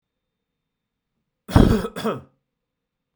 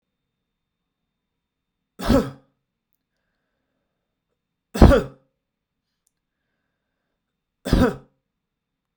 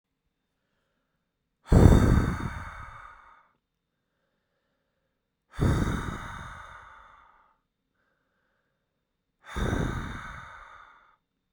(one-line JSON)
{"cough_length": "3.2 s", "cough_amplitude": 32767, "cough_signal_mean_std_ratio": 0.27, "three_cough_length": "9.0 s", "three_cough_amplitude": 32768, "three_cough_signal_mean_std_ratio": 0.2, "exhalation_length": "11.5 s", "exhalation_amplitude": 27815, "exhalation_signal_mean_std_ratio": 0.3, "survey_phase": "beta (2021-08-13 to 2022-03-07)", "age": "18-44", "gender": "Male", "wearing_mask": "No", "symptom_cough_any": true, "symptom_runny_or_blocked_nose": true, "smoker_status": "Never smoked", "respiratory_condition_asthma": false, "respiratory_condition_other": false, "recruitment_source": "REACT", "submission_delay": "2 days", "covid_test_result": "Negative", "covid_test_method": "RT-qPCR"}